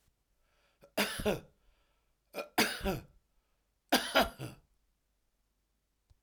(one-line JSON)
{"three_cough_length": "6.2 s", "three_cough_amplitude": 8930, "three_cough_signal_mean_std_ratio": 0.32, "survey_phase": "alpha (2021-03-01 to 2021-08-12)", "age": "45-64", "gender": "Male", "wearing_mask": "No", "symptom_none": true, "smoker_status": "Ex-smoker", "respiratory_condition_asthma": false, "respiratory_condition_other": false, "recruitment_source": "REACT", "submission_delay": "1 day", "covid_test_result": "Negative", "covid_test_method": "RT-qPCR"}